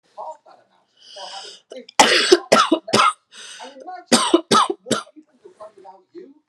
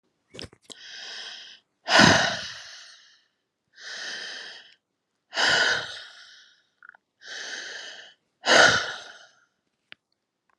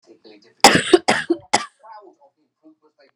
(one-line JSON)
{"three_cough_length": "6.5 s", "three_cough_amplitude": 32768, "three_cough_signal_mean_std_ratio": 0.4, "exhalation_length": "10.6 s", "exhalation_amplitude": 27130, "exhalation_signal_mean_std_ratio": 0.35, "cough_length": "3.2 s", "cough_amplitude": 32768, "cough_signal_mean_std_ratio": 0.3, "survey_phase": "alpha (2021-03-01 to 2021-08-12)", "age": "18-44", "gender": "Female", "wearing_mask": "No", "symptom_cough_any": true, "symptom_onset": "12 days", "smoker_status": "Never smoked", "respiratory_condition_asthma": false, "respiratory_condition_other": false, "recruitment_source": "REACT", "submission_delay": "1 day", "covid_test_result": "Negative", "covid_test_method": "RT-qPCR"}